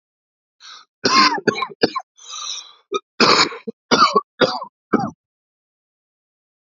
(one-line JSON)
{"cough_length": "6.7 s", "cough_amplitude": 30060, "cough_signal_mean_std_ratio": 0.39, "survey_phase": "beta (2021-08-13 to 2022-03-07)", "age": "45-64", "gender": "Male", "wearing_mask": "No", "symptom_cough_any": true, "symptom_runny_or_blocked_nose": true, "symptom_sore_throat": true, "symptom_abdominal_pain": true, "symptom_headache": true, "smoker_status": "Never smoked", "respiratory_condition_asthma": false, "respiratory_condition_other": false, "recruitment_source": "Test and Trace", "submission_delay": "1 day", "covid_test_result": "Positive", "covid_test_method": "LFT"}